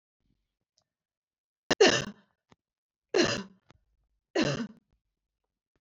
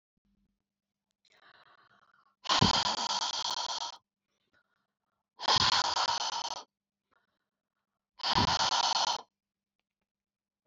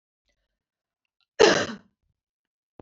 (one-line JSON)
{"three_cough_length": "5.8 s", "three_cough_amplitude": 12029, "three_cough_signal_mean_std_ratio": 0.27, "exhalation_length": "10.7 s", "exhalation_amplitude": 9859, "exhalation_signal_mean_std_ratio": 0.43, "cough_length": "2.8 s", "cough_amplitude": 22962, "cough_signal_mean_std_ratio": 0.22, "survey_phase": "beta (2021-08-13 to 2022-03-07)", "age": "45-64", "gender": "Female", "wearing_mask": "No", "symptom_cough_any": true, "symptom_fatigue": true, "symptom_onset": "4 days", "smoker_status": "Never smoked", "respiratory_condition_asthma": false, "respiratory_condition_other": false, "recruitment_source": "Test and Trace", "submission_delay": "0 days", "covid_test_result": "Positive", "covid_test_method": "RT-qPCR", "covid_ct_value": 18.4, "covid_ct_gene": "N gene"}